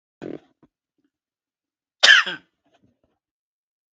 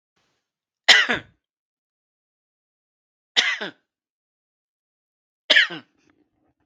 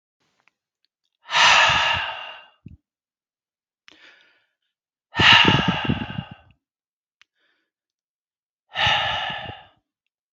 {"cough_length": "3.9 s", "cough_amplitude": 32768, "cough_signal_mean_std_ratio": 0.2, "three_cough_length": "6.7 s", "three_cough_amplitude": 32768, "three_cough_signal_mean_std_ratio": 0.23, "exhalation_length": "10.3 s", "exhalation_amplitude": 32710, "exhalation_signal_mean_std_ratio": 0.36, "survey_phase": "beta (2021-08-13 to 2022-03-07)", "age": "65+", "gender": "Male", "wearing_mask": "No", "symptom_runny_or_blocked_nose": true, "symptom_fatigue": true, "symptom_headache": true, "symptom_onset": "6 days", "smoker_status": "Ex-smoker", "respiratory_condition_asthma": false, "respiratory_condition_other": false, "recruitment_source": "REACT", "submission_delay": "1 day", "covid_test_result": "Negative", "covid_test_method": "RT-qPCR", "influenza_a_test_result": "Negative", "influenza_b_test_result": "Negative"}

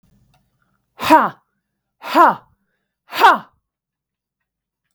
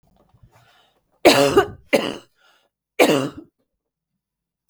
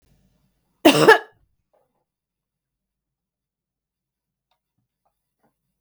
{"exhalation_length": "4.9 s", "exhalation_amplitude": 32768, "exhalation_signal_mean_std_ratio": 0.29, "three_cough_length": "4.7 s", "three_cough_amplitude": 32768, "three_cough_signal_mean_std_ratio": 0.31, "cough_length": "5.8 s", "cough_amplitude": 32768, "cough_signal_mean_std_ratio": 0.17, "survey_phase": "beta (2021-08-13 to 2022-03-07)", "age": "45-64", "gender": "Female", "wearing_mask": "No", "symptom_cough_any": true, "symptom_fatigue": true, "smoker_status": "Ex-smoker", "respiratory_condition_asthma": false, "respiratory_condition_other": false, "recruitment_source": "REACT", "submission_delay": "4 days", "covid_test_result": "Negative", "covid_test_method": "RT-qPCR", "influenza_a_test_result": "Negative", "influenza_b_test_result": "Negative"}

